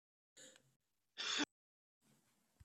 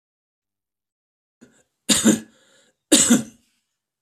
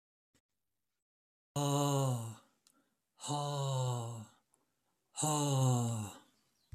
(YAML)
cough_length: 2.6 s
cough_amplitude: 1665
cough_signal_mean_std_ratio: 0.28
three_cough_length: 4.0 s
three_cough_amplitude: 32767
three_cough_signal_mean_std_ratio: 0.3
exhalation_length: 6.7 s
exhalation_amplitude: 3712
exhalation_signal_mean_std_ratio: 0.55
survey_phase: beta (2021-08-13 to 2022-03-07)
age: 65+
gender: Male
wearing_mask: 'No'
symptom_none: true
smoker_status: Never smoked
respiratory_condition_asthma: false
respiratory_condition_other: false
recruitment_source: REACT
submission_delay: 2 days
covid_test_result: Negative
covid_test_method: RT-qPCR